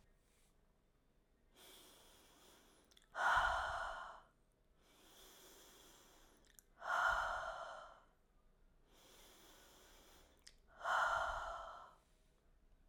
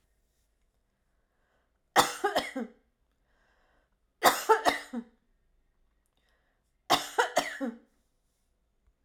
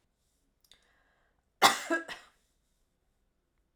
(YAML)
exhalation_length: 12.9 s
exhalation_amplitude: 2091
exhalation_signal_mean_std_ratio: 0.41
three_cough_length: 9.0 s
three_cough_amplitude: 18880
three_cough_signal_mean_std_ratio: 0.28
cough_length: 3.8 s
cough_amplitude: 16255
cough_signal_mean_std_ratio: 0.2
survey_phase: alpha (2021-03-01 to 2021-08-12)
age: 45-64
gender: Female
wearing_mask: 'No'
symptom_none: true
smoker_status: Never smoked
respiratory_condition_asthma: false
respiratory_condition_other: false
recruitment_source: REACT
submission_delay: 1 day
covid_test_method: RT-qPCR